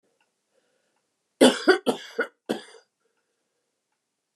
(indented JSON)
{
  "cough_length": "4.4 s",
  "cough_amplitude": 23969,
  "cough_signal_mean_std_ratio": 0.24,
  "survey_phase": "beta (2021-08-13 to 2022-03-07)",
  "age": "65+",
  "gender": "Female",
  "wearing_mask": "No",
  "symptom_cough_any": true,
  "symptom_runny_or_blocked_nose": true,
  "symptom_shortness_of_breath": true,
  "symptom_sore_throat": true,
  "symptom_fever_high_temperature": true,
  "symptom_headache": true,
  "smoker_status": "Never smoked",
  "respiratory_condition_asthma": false,
  "respiratory_condition_other": false,
  "recruitment_source": "Test and Trace",
  "submission_delay": "1 day",
  "covid_test_result": "Positive",
  "covid_test_method": "LFT"
}